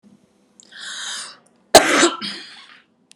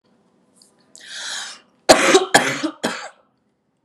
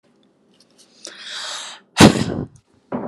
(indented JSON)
{
  "cough_length": "3.2 s",
  "cough_amplitude": 32768,
  "cough_signal_mean_std_ratio": 0.32,
  "three_cough_length": "3.8 s",
  "three_cough_amplitude": 32768,
  "three_cough_signal_mean_std_ratio": 0.36,
  "exhalation_length": "3.1 s",
  "exhalation_amplitude": 32768,
  "exhalation_signal_mean_std_ratio": 0.3,
  "survey_phase": "alpha (2021-03-01 to 2021-08-12)",
  "age": "18-44",
  "gender": "Female",
  "wearing_mask": "No",
  "symptom_none": true,
  "smoker_status": "Never smoked",
  "respiratory_condition_asthma": false,
  "respiratory_condition_other": false,
  "recruitment_source": "Test and Trace",
  "submission_delay": "0 days",
  "covid_test_result": "Negative",
  "covid_test_method": "LFT"
}